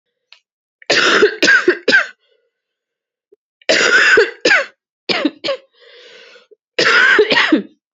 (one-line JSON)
{"three_cough_length": "7.9 s", "three_cough_amplitude": 32768, "three_cough_signal_mean_std_ratio": 0.52, "survey_phase": "beta (2021-08-13 to 2022-03-07)", "age": "18-44", "gender": "Female", "wearing_mask": "No", "symptom_cough_any": true, "symptom_runny_or_blocked_nose": true, "symptom_sore_throat": true, "symptom_fever_high_temperature": true, "symptom_change_to_sense_of_smell_or_taste": true, "symptom_onset": "3 days", "smoker_status": "Never smoked", "respiratory_condition_asthma": false, "respiratory_condition_other": false, "recruitment_source": "Test and Trace", "submission_delay": "2 days", "covid_test_result": "Positive", "covid_test_method": "RT-qPCR", "covid_ct_value": 20.5, "covid_ct_gene": "ORF1ab gene", "covid_ct_mean": 20.7, "covid_viral_load": "160000 copies/ml", "covid_viral_load_category": "Low viral load (10K-1M copies/ml)"}